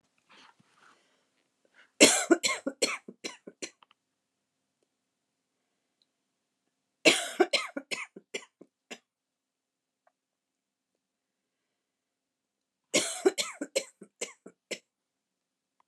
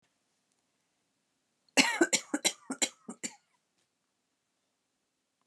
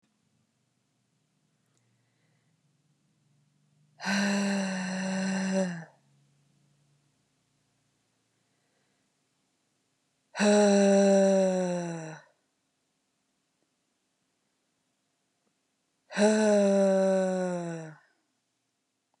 {
  "three_cough_length": "15.9 s",
  "three_cough_amplitude": 25342,
  "three_cough_signal_mean_std_ratio": 0.22,
  "cough_length": "5.5 s",
  "cough_amplitude": 13718,
  "cough_signal_mean_std_ratio": 0.24,
  "exhalation_length": "19.2 s",
  "exhalation_amplitude": 8528,
  "exhalation_signal_mean_std_ratio": 0.42,
  "survey_phase": "alpha (2021-03-01 to 2021-08-12)",
  "age": "45-64",
  "gender": "Female",
  "wearing_mask": "No",
  "symptom_none": true,
  "smoker_status": "Never smoked",
  "respiratory_condition_asthma": false,
  "respiratory_condition_other": false,
  "recruitment_source": "REACT",
  "submission_delay": "2 days",
  "covid_test_result": "Negative",
  "covid_test_method": "RT-qPCR"
}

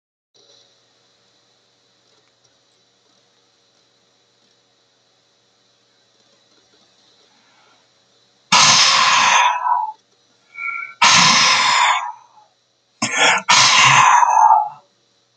{
  "exhalation_length": "15.4 s",
  "exhalation_amplitude": 32768,
  "exhalation_signal_mean_std_ratio": 0.44,
  "survey_phase": "beta (2021-08-13 to 2022-03-07)",
  "age": "65+",
  "gender": "Male",
  "wearing_mask": "No",
  "symptom_none": true,
  "smoker_status": "Ex-smoker",
  "respiratory_condition_asthma": false,
  "respiratory_condition_other": false,
  "recruitment_source": "REACT",
  "submission_delay": "2 days",
  "covid_test_result": "Negative",
  "covid_test_method": "RT-qPCR",
  "influenza_a_test_result": "Negative",
  "influenza_b_test_result": "Negative"
}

